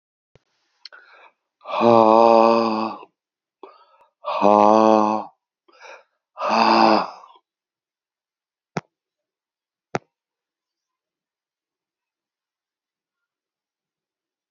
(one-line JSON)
{"exhalation_length": "14.5 s", "exhalation_amplitude": 30128, "exhalation_signal_mean_std_ratio": 0.31, "survey_phase": "beta (2021-08-13 to 2022-03-07)", "age": "65+", "gender": "Male", "wearing_mask": "No", "symptom_cough_any": true, "smoker_status": "Ex-smoker", "respiratory_condition_asthma": false, "respiratory_condition_other": true, "recruitment_source": "REACT", "submission_delay": "1 day", "covid_test_result": "Negative", "covid_test_method": "RT-qPCR", "influenza_a_test_result": "Negative", "influenza_b_test_result": "Negative"}